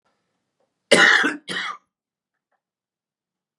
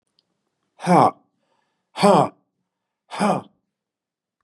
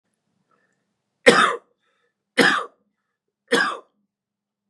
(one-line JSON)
{"cough_length": "3.6 s", "cough_amplitude": 32225, "cough_signal_mean_std_ratio": 0.3, "exhalation_length": "4.4 s", "exhalation_amplitude": 29195, "exhalation_signal_mean_std_ratio": 0.31, "three_cough_length": "4.7 s", "three_cough_amplitude": 32767, "three_cough_signal_mean_std_ratio": 0.29, "survey_phase": "beta (2021-08-13 to 2022-03-07)", "age": "45-64", "gender": "Male", "wearing_mask": "No", "symptom_none": true, "smoker_status": "Ex-smoker", "respiratory_condition_asthma": false, "respiratory_condition_other": false, "recruitment_source": "REACT", "submission_delay": "3 days", "covid_test_result": "Negative", "covid_test_method": "RT-qPCR", "influenza_a_test_result": "Negative", "influenza_b_test_result": "Negative"}